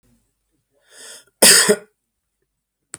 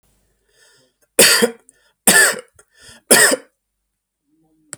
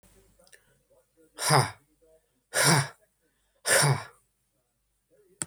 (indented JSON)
{
  "cough_length": "3.0 s",
  "cough_amplitude": 32768,
  "cough_signal_mean_std_ratio": 0.27,
  "three_cough_length": "4.8 s",
  "three_cough_amplitude": 32768,
  "three_cough_signal_mean_std_ratio": 0.34,
  "exhalation_length": "5.5 s",
  "exhalation_amplitude": 14158,
  "exhalation_signal_mean_std_ratio": 0.34,
  "survey_phase": "alpha (2021-03-01 to 2021-08-12)",
  "age": "45-64",
  "gender": "Male",
  "wearing_mask": "No",
  "symptom_none": true,
  "smoker_status": "Ex-smoker",
  "respiratory_condition_asthma": false,
  "respiratory_condition_other": false,
  "recruitment_source": "REACT",
  "submission_delay": "2 days",
  "covid_test_result": "Negative",
  "covid_test_method": "RT-qPCR"
}